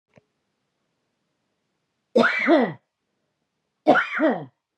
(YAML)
cough_length: 4.8 s
cough_amplitude: 25668
cough_signal_mean_std_ratio: 0.36
survey_phase: beta (2021-08-13 to 2022-03-07)
age: 45-64
gender: Female
wearing_mask: 'No'
symptom_runny_or_blocked_nose: true
symptom_fatigue: true
smoker_status: Ex-smoker
respiratory_condition_asthma: false
respiratory_condition_other: false
recruitment_source: REACT
submission_delay: 2 days
covid_test_result: Negative
covid_test_method: RT-qPCR
influenza_a_test_result: Negative
influenza_b_test_result: Negative